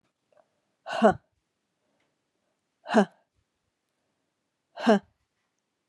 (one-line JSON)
{"exhalation_length": "5.9 s", "exhalation_amplitude": 17310, "exhalation_signal_mean_std_ratio": 0.22, "survey_phase": "beta (2021-08-13 to 2022-03-07)", "age": "45-64", "gender": "Female", "wearing_mask": "No", "symptom_cough_any": true, "symptom_runny_or_blocked_nose": true, "symptom_abdominal_pain": true, "symptom_fatigue": true, "symptom_fever_high_temperature": true, "symptom_headache": true, "symptom_other": true, "smoker_status": "Never smoked", "respiratory_condition_asthma": false, "respiratory_condition_other": false, "recruitment_source": "Test and Trace", "submission_delay": "1 day", "covid_test_result": "Positive", "covid_test_method": "RT-qPCR"}